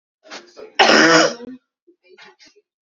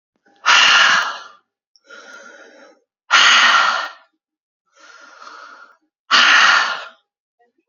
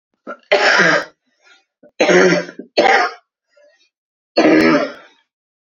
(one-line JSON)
{"cough_length": "2.8 s", "cough_amplitude": 30408, "cough_signal_mean_std_ratio": 0.38, "exhalation_length": "7.7 s", "exhalation_amplitude": 31286, "exhalation_signal_mean_std_ratio": 0.45, "three_cough_length": "5.6 s", "three_cough_amplitude": 29145, "three_cough_signal_mean_std_ratio": 0.5, "survey_phase": "beta (2021-08-13 to 2022-03-07)", "age": "18-44", "gender": "Female", "wearing_mask": "Yes", "symptom_none": true, "smoker_status": "Current smoker (1 to 10 cigarettes per day)", "respiratory_condition_asthma": false, "respiratory_condition_other": false, "recruitment_source": "REACT", "submission_delay": "2 days", "covid_test_result": "Negative", "covid_test_method": "RT-qPCR", "influenza_a_test_result": "Negative", "influenza_b_test_result": "Negative"}